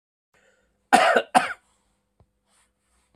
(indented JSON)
{
  "cough_length": "3.2 s",
  "cough_amplitude": 32463,
  "cough_signal_mean_std_ratio": 0.28,
  "survey_phase": "beta (2021-08-13 to 2022-03-07)",
  "age": "45-64",
  "gender": "Male",
  "wearing_mask": "No",
  "symptom_none": true,
  "smoker_status": "Ex-smoker",
  "respiratory_condition_asthma": false,
  "respiratory_condition_other": false,
  "recruitment_source": "REACT",
  "submission_delay": "1 day",
  "covid_test_result": "Negative",
  "covid_test_method": "RT-qPCR"
}